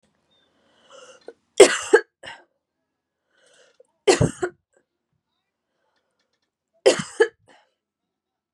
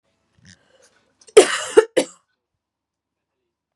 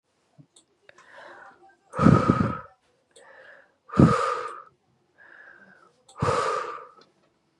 {"three_cough_length": "8.5 s", "three_cough_amplitude": 32768, "three_cough_signal_mean_std_ratio": 0.21, "cough_length": "3.8 s", "cough_amplitude": 32768, "cough_signal_mean_std_ratio": 0.21, "exhalation_length": "7.6 s", "exhalation_amplitude": 25742, "exhalation_signal_mean_std_ratio": 0.34, "survey_phase": "beta (2021-08-13 to 2022-03-07)", "age": "18-44", "gender": "Female", "wearing_mask": "No", "symptom_cough_any": true, "symptom_runny_or_blocked_nose": true, "symptom_sore_throat": true, "symptom_onset": "3 days", "smoker_status": "Ex-smoker", "respiratory_condition_asthma": false, "respiratory_condition_other": false, "recruitment_source": "Test and Trace", "submission_delay": "2 days", "covid_test_result": "Positive", "covid_test_method": "RT-qPCR", "covid_ct_value": 25.6, "covid_ct_gene": "ORF1ab gene"}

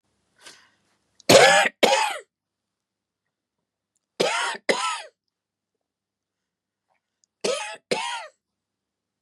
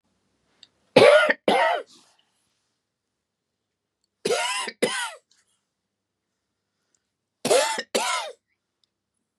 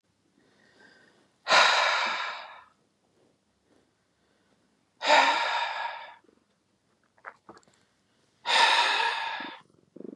{"three_cough_length": "9.2 s", "three_cough_amplitude": 32164, "three_cough_signal_mean_std_ratio": 0.3, "cough_length": "9.4 s", "cough_amplitude": 28688, "cough_signal_mean_std_ratio": 0.33, "exhalation_length": "10.2 s", "exhalation_amplitude": 14465, "exhalation_signal_mean_std_ratio": 0.41, "survey_phase": "beta (2021-08-13 to 2022-03-07)", "age": "45-64", "gender": "Female", "wearing_mask": "No", "symptom_none": true, "smoker_status": "Never smoked", "respiratory_condition_asthma": false, "respiratory_condition_other": false, "recruitment_source": "REACT", "submission_delay": "3 days", "covid_test_result": "Negative", "covid_test_method": "RT-qPCR", "influenza_a_test_result": "Negative", "influenza_b_test_result": "Negative"}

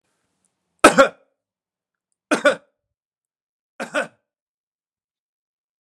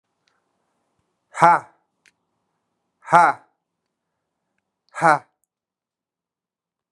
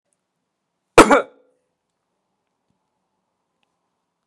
{"three_cough_length": "5.8 s", "three_cough_amplitude": 32768, "three_cough_signal_mean_std_ratio": 0.2, "exhalation_length": "6.9 s", "exhalation_amplitude": 32767, "exhalation_signal_mean_std_ratio": 0.21, "cough_length": "4.3 s", "cough_amplitude": 32768, "cough_signal_mean_std_ratio": 0.16, "survey_phase": "alpha (2021-03-01 to 2021-08-12)", "age": "45-64", "gender": "Male", "wearing_mask": "No", "symptom_none": true, "smoker_status": "Never smoked", "respiratory_condition_asthma": false, "respiratory_condition_other": false, "recruitment_source": "REACT", "submission_delay": "1 day", "covid_test_result": "Negative", "covid_test_method": "RT-qPCR"}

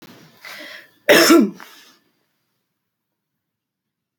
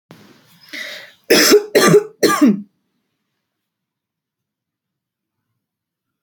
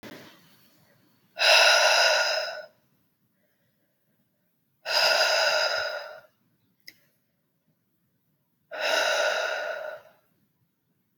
{"cough_length": "4.2 s", "cough_amplitude": 32767, "cough_signal_mean_std_ratio": 0.28, "three_cough_length": "6.2 s", "three_cough_amplitude": 32768, "three_cough_signal_mean_std_ratio": 0.34, "exhalation_length": "11.2 s", "exhalation_amplitude": 18666, "exhalation_signal_mean_std_ratio": 0.45, "survey_phase": "beta (2021-08-13 to 2022-03-07)", "age": "18-44", "gender": "Female", "wearing_mask": "No", "symptom_runny_or_blocked_nose": true, "symptom_sore_throat": true, "symptom_change_to_sense_of_smell_or_taste": true, "symptom_loss_of_taste": true, "symptom_onset": "3 days", "smoker_status": "Never smoked", "respiratory_condition_asthma": false, "respiratory_condition_other": false, "recruitment_source": "Test and Trace", "submission_delay": "1 day", "covid_test_result": "Positive", "covid_test_method": "RT-qPCR"}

